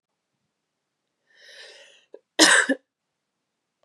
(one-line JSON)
{"cough_length": "3.8 s", "cough_amplitude": 31041, "cough_signal_mean_std_ratio": 0.23, "survey_phase": "beta (2021-08-13 to 2022-03-07)", "age": "18-44", "gender": "Female", "wearing_mask": "No", "symptom_cough_any": true, "symptom_new_continuous_cough": true, "symptom_runny_or_blocked_nose": true, "symptom_fatigue": true, "symptom_loss_of_taste": true, "symptom_onset": "5 days", "smoker_status": "Ex-smoker", "respiratory_condition_asthma": false, "respiratory_condition_other": false, "recruitment_source": "Test and Trace", "submission_delay": "1 day", "covid_test_result": "Positive", "covid_test_method": "ePCR"}